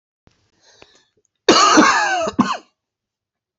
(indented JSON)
{
  "cough_length": "3.6 s",
  "cough_amplitude": 29597,
  "cough_signal_mean_std_ratio": 0.42,
  "survey_phase": "beta (2021-08-13 to 2022-03-07)",
  "age": "18-44",
  "gender": "Male",
  "wearing_mask": "No",
  "symptom_cough_any": true,
  "symptom_runny_or_blocked_nose": true,
  "symptom_sore_throat": true,
  "symptom_fatigue": true,
  "symptom_fever_high_temperature": true,
  "symptom_headache": true,
  "smoker_status": "Never smoked",
  "respiratory_condition_asthma": false,
  "respiratory_condition_other": false,
  "recruitment_source": "Test and Trace",
  "submission_delay": "2 days",
  "covid_test_result": "Positive",
  "covid_test_method": "RT-qPCR",
  "covid_ct_value": 25.7,
  "covid_ct_gene": "ORF1ab gene"
}